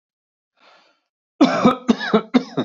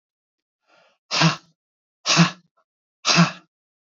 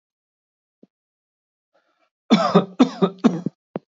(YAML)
cough_length: 2.6 s
cough_amplitude: 26905
cough_signal_mean_std_ratio: 0.4
exhalation_length: 3.8 s
exhalation_amplitude: 22670
exhalation_signal_mean_std_ratio: 0.34
three_cough_length: 3.9 s
three_cough_amplitude: 28104
three_cough_signal_mean_std_ratio: 0.3
survey_phase: beta (2021-08-13 to 2022-03-07)
age: 18-44
gender: Male
wearing_mask: 'No'
symptom_none: true
smoker_status: Current smoker (1 to 10 cigarettes per day)
respiratory_condition_asthma: false
respiratory_condition_other: false
recruitment_source: Test and Trace
submission_delay: 1 day
covid_test_result: Negative
covid_test_method: RT-qPCR